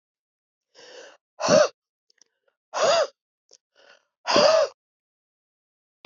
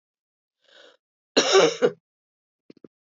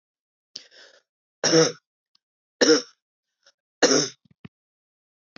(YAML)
exhalation_length: 6.1 s
exhalation_amplitude: 18989
exhalation_signal_mean_std_ratio: 0.33
cough_length: 3.1 s
cough_amplitude: 19692
cough_signal_mean_std_ratio: 0.3
three_cough_length: 5.4 s
three_cough_amplitude: 22256
three_cough_signal_mean_std_ratio: 0.29
survey_phase: beta (2021-08-13 to 2022-03-07)
age: 65+
gender: Female
wearing_mask: 'No'
symptom_cough_any: true
symptom_runny_or_blocked_nose: true
symptom_fatigue: true
symptom_headache: true
symptom_onset: 5 days
smoker_status: Ex-smoker
respiratory_condition_asthma: false
respiratory_condition_other: false
recruitment_source: Test and Trace
submission_delay: 1 day
covid_test_result: Positive
covid_test_method: RT-qPCR
covid_ct_value: 17.6
covid_ct_gene: N gene
covid_ct_mean: 18.2
covid_viral_load: 1100000 copies/ml
covid_viral_load_category: High viral load (>1M copies/ml)